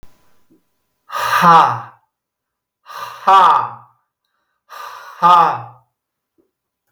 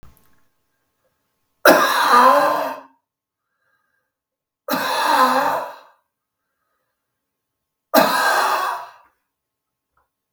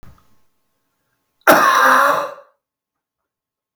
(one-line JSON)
{"exhalation_length": "6.9 s", "exhalation_amplitude": 32768, "exhalation_signal_mean_std_ratio": 0.38, "three_cough_length": "10.3 s", "three_cough_amplitude": 32768, "three_cough_signal_mean_std_ratio": 0.42, "cough_length": "3.8 s", "cough_amplitude": 32768, "cough_signal_mean_std_ratio": 0.39, "survey_phase": "beta (2021-08-13 to 2022-03-07)", "age": "45-64", "gender": "Male", "wearing_mask": "No", "symptom_sore_throat": true, "smoker_status": "Never smoked", "respiratory_condition_asthma": false, "respiratory_condition_other": false, "recruitment_source": "REACT", "submission_delay": "1 day", "covid_test_result": "Negative", "covid_test_method": "RT-qPCR"}